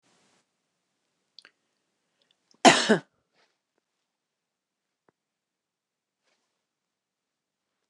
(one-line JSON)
{"cough_length": "7.9 s", "cough_amplitude": 26985, "cough_signal_mean_std_ratio": 0.13, "survey_phase": "beta (2021-08-13 to 2022-03-07)", "age": "65+", "gender": "Female", "wearing_mask": "No", "symptom_none": true, "smoker_status": "Never smoked", "respiratory_condition_asthma": false, "respiratory_condition_other": false, "recruitment_source": "REACT", "submission_delay": "1 day", "covid_test_result": "Negative", "covid_test_method": "RT-qPCR", "influenza_a_test_result": "Negative", "influenza_b_test_result": "Negative"}